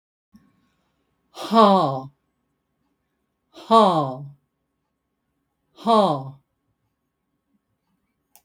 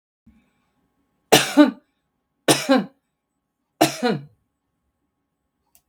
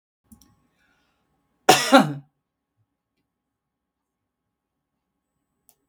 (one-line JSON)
{"exhalation_length": "8.4 s", "exhalation_amplitude": 29928, "exhalation_signal_mean_std_ratio": 0.3, "three_cough_length": "5.9 s", "three_cough_amplitude": 32768, "three_cough_signal_mean_std_ratio": 0.28, "cough_length": "5.9 s", "cough_amplitude": 32767, "cough_signal_mean_std_ratio": 0.18, "survey_phase": "beta (2021-08-13 to 2022-03-07)", "age": "65+", "gender": "Female", "wearing_mask": "No", "symptom_none": true, "smoker_status": "Never smoked", "respiratory_condition_asthma": false, "respiratory_condition_other": true, "recruitment_source": "REACT", "submission_delay": "2 days", "covid_test_result": "Negative", "covid_test_method": "RT-qPCR", "influenza_a_test_result": "Negative", "influenza_b_test_result": "Negative"}